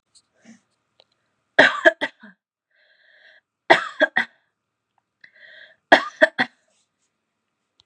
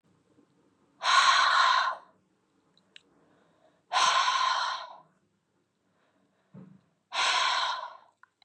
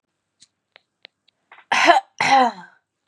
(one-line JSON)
{"three_cough_length": "7.9 s", "three_cough_amplitude": 32768, "three_cough_signal_mean_std_ratio": 0.22, "exhalation_length": "8.4 s", "exhalation_amplitude": 11304, "exhalation_signal_mean_std_ratio": 0.46, "cough_length": "3.1 s", "cough_amplitude": 32195, "cough_signal_mean_std_ratio": 0.36, "survey_phase": "beta (2021-08-13 to 2022-03-07)", "age": "18-44", "gender": "Female", "wearing_mask": "No", "symptom_cough_any": true, "symptom_runny_or_blocked_nose": true, "symptom_sore_throat": true, "symptom_fatigue": true, "symptom_fever_high_temperature": true, "symptom_headache": true, "smoker_status": "Never smoked", "respiratory_condition_asthma": false, "respiratory_condition_other": false, "recruitment_source": "Test and Trace", "submission_delay": "1 day", "covid_test_result": "Positive", "covid_test_method": "RT-qPCR", "covid_ct_value": 18.2, "covid_ct_gene": "ORF1ab gene"}